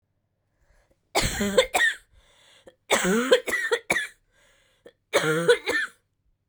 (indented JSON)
{
  "three_cough_length": "6.5 s",
  "three_cough_amplitude": 20631,
  "three_cough_signal_mean_std_ratio": 0.47,
  "survey_phase": "beta (2021-08-13 to 2022-03-07)",
  "age": "18-44",
  "gender": "Female",
  "wearing_mask": "No",
  "symptom_cough_any": true,
  "symptom_runny_or_blocked_nose": true,
  "symptom_shortness_of_breath": true,
  "symptom_sore_throat": true,
  "symptom_fatigue": true,
  "symptom_headache": true,
  "symptom_change_to_sense_of_smell_or_taste": true,
  "smoker_status": "Never smoked",
  "respiratory_condition_asthma": false,
  "respiratory_condition_other": false,
  "recruitment_source": "Test and Trace",
  "submission_delay": "2 days",
  "covid_test_result": "Positive",
  "covid_test_method": "LFT"
}